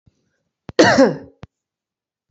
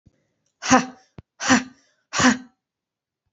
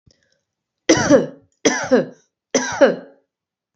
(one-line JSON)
{"cough_length": "2.3 s", "cough_amplitude": 32767, "cough_signal_mean_std_ratio": 0.32, "exhalation_length": "3.3 s", "exhalation_amplitude": 29164, "exhalation_signal_mean_std_ratio": 0.32, "three_cough_length": "3.8 s", "three_cough_amplitude": 29210, "three_cough_signal_mean_std_ratio": 0.4, "survey_phase": "beta (2021-08-13 to 2022-03-07)", "age": "18-44", "gender": "Female", "wearing_mask": "No", "symptom_none": true, "symptom_onset": "13 days", "smoker_status": "Never smoked", "respiratory_condition_asthma": false, "respiratory_condition_other": false, "recruitment_source": "REACT", "submission_delay": "1 day", "covid_test_result": "Negative", "covid_test_method": "RT-qPCR", "influenza_a_test_result": "Negative", "influenza_b_test_result": "Negative"}